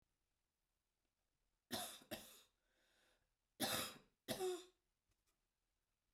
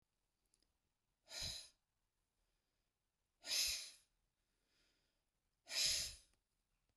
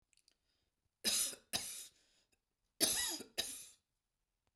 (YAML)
three_cough_length: 6.1 s
three_cough_amplitude: 1237
three_cough_signal_mean_std_ratio: 0.33
exhalation_length: 7.0 s
exhalation_amplitude: 1518
exhalation_signal_mean_std_ratio: 0.31
cough_length: 4.6 s
cough_amplitude: 4785
cough_signal_mean_std_ratio: 0.38
survey_phase: beta (2021-08-13 to 2022-03-07)
age: 45-64
gender: Female
wearing_mask: 'No'
symptom_none: true
smoker_status: Never smoked
respiratory_condition_asthma: false
respiratory_condition_other: false
recruitment_source: REACT
submission_delay: 1 day
covid_test_result: Negative
covid_test_method: RT-qPCR
influenza_a_test_result: Negative
influenza_b_test_result: Negative